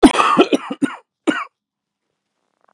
cough_length: 2.7 s
cough_amplitude: 32768
cough_signal_mean_std_ratio: 0.37
survey_phase: beta (2021-08-13 to 2022-03-07)
age: 45-64
gender: Male
wearing_mask: 'No'
symptom_cough_any: true
symptom_runny_or_blocked_nose: true
symptom_change_to_sense_of_smell_or_taste: true
symptom_onset: 6 days
smoker_status: Ex-smoker
respiratory_condition_asthma: false
respiratory_condition_other: false
recruitment_source: Test and Trace
submission_delay: 1 day
covid_test_result: Positive
covid_test_method: RT-qPCR
covid_ct_value: 21.1
covid_ct_gene: ORF1ab gene
covid_ct_mean: 22.0
covid_viral_load: 59000 copies/ml
covid_viral_load_category: Low viral load (10K-1M copies/ml)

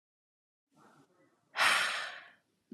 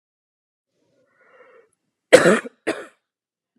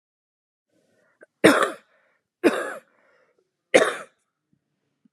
exhalation_length: 2.7 s
exhalation_amplitude: 6237
exhalation_signal_mean_std_ratio: 0.35
cough_length: 3.6 s
cough_amplitude: 32768
cough_signal_mean_std_ratio: 0.21
three_cough_length: 5.1 s
three_cough_amplitude: 28865
three_cough_signal_mean_std_ratio: 0.26
survey_phase: beta (2021-08-13 to 2022-03-07)
age: 18-44
gender: Female
wearing_mask: 'No'
symptom_new_continuous_cough: true
symptom_runny_or_blocked_nose: true
symptom_sore_throat: true
symptom_fatigue: true
symptom_headache: true
symptom_onset: 4 days
smoker_status: Never smoked
respiratory_condition_asthma: false
respiratory_condition_other: false
recruitment_source: REACT
submission_delay: 1 day
covid_test_result: Negative
covid_test_method: RT-qPCR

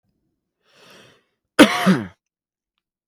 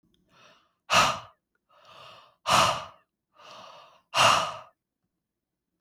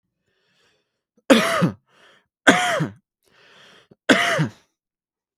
cough_length: 3.1 s
cough_amplitude: 32768
cough_signal_mean_std_ratio: 0.25
exhalation_length: 5.8 s
exhalation_amplitude: 14351
exhalation_signal_mean_std_ratio: 0.34
three_cough_length: 5.4 s
three_cough_amplitude: 32768
three_cough_signal_mean_std_ratio: 0.35
survey_phase: beta (2021-08-13 to 2022-03-07)
age: 18-44
gender: Male
wearing_mask: 'No'
symptom_cough_any: true
symptom_runny_or_blocked_nose: true
symptom_sore_throat: true
symptom_onset: 4 days
smoker_status: Prefer not to say
respiratory_condition_asthma: true
respiratory_condition_other: false
recruitment_source: REACT
submission_delay: 1 day
covid_test_result: Positive
covid_test_method: RT-qPCR
covid_ct_value: 20.5
covid_ct_gene: E gene
influenza_a_test_result: Negative
influenza_b_test_result: Negative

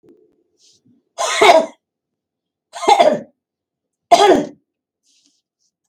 three_cough_length: 5.9 s
three_cough_amplitude: 32768
three_cough_signal_mean_std_ratio: 0.34
survey_phase: beta (2021-08-13 to 2022-03-07)
age: 45-64
gender: Female
wearing_mask: 'No'
symptom_none: true
smoker_status: Never smoked
respiratory_condition_asthma: false
respiratory_condition_other: false
recruitment_source: REACT
submission_delay: 3 days
covid_test_result: Negative
covid_test_method: RT-qPCR
influenza_a_test_result: Negative
influenza_b_test_result: Negative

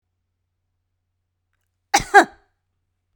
cough_length: 3.2 s
cough_amplitude: 32768
cough_signal_mean_std_ratio: 0.17
survey_phase: beta (2021-08-13 to 2022-03-07)
age: 18-44
gender: Female
wearing_mask: 'No'
symptom_none: true
smoker_status: Never smoked
respiratory_condition_asthma: false
respiratory_condition_other: false
recruitment_source: REACT
submission_delay: 1 day
covid_test_result: Negative
covid_test_method: RT-qPCR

